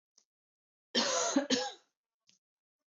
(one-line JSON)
{"cough_length": "2.9 s", "cough_amplitude": 5479, "cough_signal_mean_std_ratio": 0.4, "survey_phase": "beta (2021-08-13 to 2022-03-07)", "age": "45-64", "gender": "Female", "wearing_mask": "No", "symptom_none": true, "smoker_status": "Never smoked", "respiratory_condition_asthma": false, "respiratory_condition_other": false, "recruitment_source": "REACT", "submission_delay": "2 days", "covid_test_result": "Negative", "covid_test_method": "RT-qPCR", "influenza_a_test_result": "Negative", "influenza_b_test_result": "Negative"}